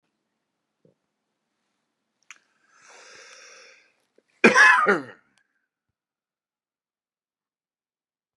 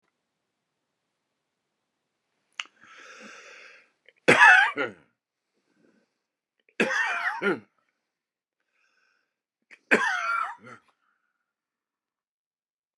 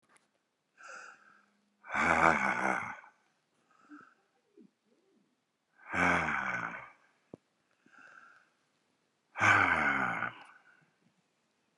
{"cough_length": "8.4 s", "cough_amplitude": 29573, "cough_signal_mean_std_ratio": 0.2, "three_cough_length": "13.0 s", "three_cough_amplitude": 23079, "three_cough_signal_mean_std_ratio": 0.26, "exhalation_length": "11.8 s", "exhalation_amplitude": 13510, "exhalation_signal_mean_std_ratio": 0.38, "survey_phase": "beta (2021-08-13 to 2022-03-07)", "age": "65+", "gender": "Male", "wearing_mask": "No", "symptom_none": true, "smoker_status": "Ex-smoker", "respiratory_condition_asthma": false, "respiratory_condition_other": true, "recruitment_source": "REACT", "submission_delay": "2 days", "covid_test_result": "Negative", "covid_test_method": "RT-qPCR"}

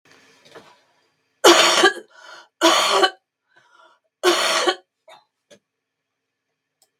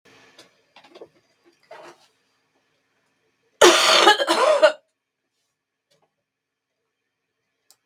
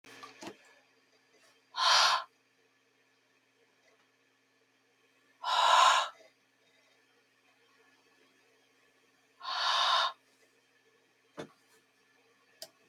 {"three_cough_length": "7.0 s", "three_cough_amplitude": 32768, "three_cough_signal_mean_std_ratio": 0.36, "cough_length": "7.9 s", "cough_amplitude": 32768, "cough_signal_mean_std_ratio": 0.28, "exhalation_length": "12.9 s", "exhalation_amplitude": 8789, "exhalation_signal_mean_std_ratio": 0.31, "survey_phase": "beta (2021-08-13 to 2022-03-07)", "age": "45-64", "gender": "Female", "wearing_mask": "No", "symptom_cough_any": true, "symptom_runny_or_blocked_nose": true, "symptom_fever_high_temperature": true, "symptom_other": true, "smoker_status": "Never smoked", "respiratory_condition_asthma": false, "respiratory_condition_other": false, "recruitment_source": "Test and Trace", "submission_delay": "2 days", "covid_test_result": "Positive", "covid_test_method": "RT-qPCR"}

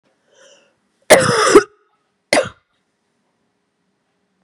{"cough_length": "4.4 s", "cough_amplitude": 32768, "cough_signal_mean_std_ratio": 0.28, "survey_phase": "beta (2021-08-13 to 2022-03-07)", "age": "45-64", "gender": "Female", "wearing_mask": "No", "symptom_cough_any": true, "symptom_runny_or_blocked_nose": true, "symptom_other": true, "smoker_status": "Current smoker (1 to 10 cigarettes per day)", "respiratory_condition_asthma": true, "respiratory_condition_other": false, "recruitment_source": "Test and Trace", "submission_delay": "1 day", "covid_test_result": "Positive", "covid_test_method": "LFT"}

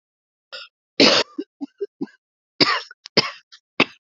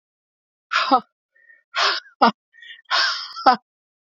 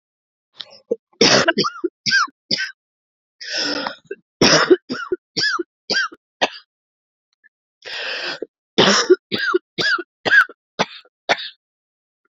{"cough_length": "4.1 s", "cough_amplitude": 32125, "cough_signal_mean_std_ratio": 0.31, "exhalation_length": "4.2 s", "exhalation_amplitude": 28549, "exhalation_signal_mean_std_ratio": 0.38, "three_cough_length": "12.4 s", "three_cough_amplitude": 32768, "three_cough_signal_mean_std_ratio": 0.42, "survey_phase": "beta (2021-08-13 to 2022-03-07)", "age": "45-64", "gender": "Female", "wearing_mask": "No", "symptom_cough_any": true, "symptom_runny_or_blocked_nose": true, "symptom_shortness_of_breath": true, "symptom_sore_throat": true, "symptom_diarrhoea": true, "symptom_fatigue": true, "symptom_fever_high_temperature": true, "symptom_change_to_sense_of_smell_or_taste": true, "symptom_loss_of_taste": true, "smoker_status": "Never smoked", "respiratory_condition_asthma": false, "respiratory_condition_other": false, "recruitment_source": "Test and Trace", "submission_delay": "2 days", "covid_test_result": "Positive", "covid_test_method": "LFT"}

